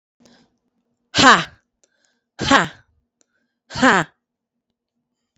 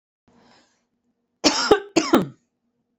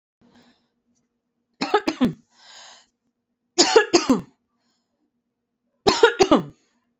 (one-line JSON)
{"exhalation_length": "5.4 s", "exhalation_amplitude": 30119, "exhalation_signal_mean_std_ratio": 0.28, "cough_length": "3.0 s", "cough_amplitude": 32767, "cough_signal_mean_std_ratio": 0.32, "three_cough_length": "7.0 s", "three_cough_amplitude": 32767, "three_cough_signal_mean_std_ratio": 0.31, "survey_phase": "beta (2021-08-13 to 2022-03-07)", "age": "18-44", "gender": "Female", "wearing_mask": "No", "symptom_fatigue": true, "symptom_onset": "2 days", "smoker_status": "Ex-smoker", "respiratory_condition_asthma": false, "respiratory_condition_other": false, "recruitment_source": "REACT", "submission_delay": "2 days", "covid_test_result": "Negative", "covid_test_method": "RT-qPCR"}